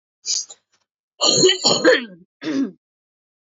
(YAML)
cough_length: 3.6 s
cough_amplitude: 31430
cough_signal_mean_std_ratio: 0.45
survey_phase: beta (2021-08-13 to 2022-03-07)
age: 18-44
gender: Female
wearing_mask: 'No'
symptom_cough_any: true
symptom_sore_throat: true
symptom_change_to_sense_of_smell_or_taste: true
smoker_status: Never smoked
respiratory_condition_asthma: false
respiratory_condition_other: false
recruitment_source: Test and Trace
submission_delay: 1 day
covid_test_result: Positive
covid_test_method: LFT